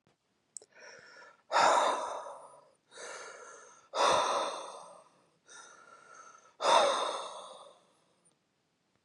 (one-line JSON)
{"exhalation_length": "9.0 s", "exhalation_amplitude": 7708, "exhalation_signal_mean_std_ratio": 0.41, "survey_phase": "beta (2021-08-13 to 2022-03-07)", "age": "18-44", "gender": "Male", "wearing_mask": "No", "symptom_cough_any": true, "symptom_runny_or_blocked_nose": true, "symptom_fatigue": true, "symptom_headache": true, "symptom_other": true, "symptom_onset": "3 days", "smoker_status": "Never smoked", "respiratory_condition_asthma": true, "respiratory_condition_other": false, "recruitment_source": "Test and Trace", "submission_delay": "2 days", "covid_test_result": "Positive", "covid_test_method": "ePCR"}